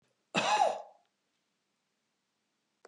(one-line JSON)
{"cough_length": "2.9 s", "cough_amplitude": 5971, "cough_signal_mean_std_ratio": 0.32, "survey_phase": "beta (2021-08-13 to 2022-03-07)", "age": "65+", "gender": "Female", "wearing_mask": "No", "symptom_none": true, "smoker_status": "Never smoked", "respiratory_condition_asthma": false, "respiratory_condition_other": false, "recruitment_source": "REACT", "submission_delay": "2 days", "covid_test_result": "Negative", "covid_test_method": "RT-qPCR", "influenza_a_test_result": "Negative", "influenza_b_test_result": "Negative"}